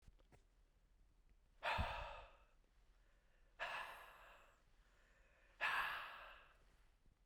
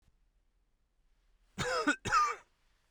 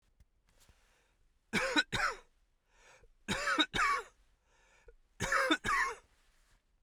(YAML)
exhalation_length: 7.3 s
exhalation_amplitude: 1119
exhalation_signal_mean_std_ratio: 0.43
cough_length: 2.9 s
cough_amplitude: 4841
cough_signal_mean_std_ratio: 0.39
three_cough_length: 6.8 s
three_cough_amplitude: 6734
three_cough_signal_mean_std_ratio: 0.44
survey_phase: beta (2021-08-13 to 2022-03-07)
age: 18-44
gender: Male
wearing_mask: 'No'
symptom_none: true
smoker_status: Ex-smoker
respiratory_condition_asthma: false
respiratory_condition_other: false
recruitment_source: REACT
submission_delay: 13 days
covid_test_result: Negative
covid_test_method: RT-qPCR